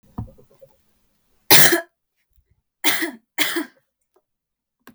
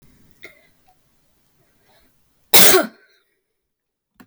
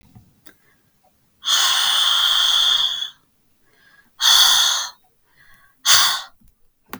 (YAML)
three_cough_length: 4.9 s
three_cough_amplitude: 32768
three_cough_signal_mean_std_ratio: 0.28
cough_length: 4.3 s
cough_amplitude: 32768
cough_signal_mean_std_ratio: 0.23
exhalation_length: 7.0 s
exhalation_amplitude: 32768
exhalation_signal_mean_std_ratio: 0.53
survey_phase: beta (2021-08-13 to 2022-03-07)
age: 18-44
gender: Female
wearing_mask: 'No'
symptom_runny_or_blocked_nose: true
symptom_sore_throat: true
symptom_headache: true
symptom_onset: 3 days
smoker_status: Never smoked
respiratory_condition_asthma: false
respiratory_condition_other: false
recruitment_source: REACT
submission_delay: 2 days
covid_test_result: Negative
covid_test_method: RT-qPCR
influenza_a_test_result: Negative
influenza_b_test_result: Negative